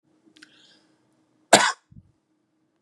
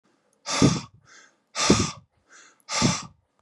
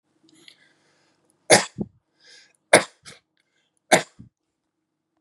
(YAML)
cough_length: 2.8 s
cough_amplitude: 32767
cough_signal_mean_std_ratio: 0.19
exhalation_length: 3.4 s
exhalation_amplitude: 21314
exhalation_signal_mean_std_ratio: 0.41
three_cough_length: 5.2 s
three_cough_amplitude: 32768
three_cough_signal_mean_std_ratio: 0.19
survey_phase: beta (2021-08-13 to 2022-03-07)
age: 45-64
gender: Male
wearing_mask: 'No'
symptom_none: true
smoker_status: Never smoked
respiratory_condition_asthma: false
respiratory_condition_other: false
recruitment_source: REACT
submission_delay: 1 day
covid_test_result: Negative
covid_test_method: RT-qPCR
influenza_a_test_result: Negative
influenza_b_test_result: Negative